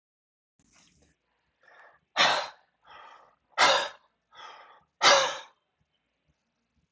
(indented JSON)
{
  "exhalation_length": "6.9 s",
  "exhalation_amplitude": 14970,
  "exhalation_signal_mean_std_ratio": 0.29,
  "survey_phase": "alpha (2021-03-01 to 2021-08-12)",
  "age": "18-44",
  "gender": "Male",
  "wearing_mask": "No",
  "symptom_none": true,
  "smoker_status": "Never smoked",
  "respiratory_condition_asthma": true,
  "respiratory_condition_other": false,
  "recruitment_source": "REACT",
  "submission_delay": "2 days",
  "covid_test_result": "Negative",
  "covid_test_method": "RT-qPCR"
}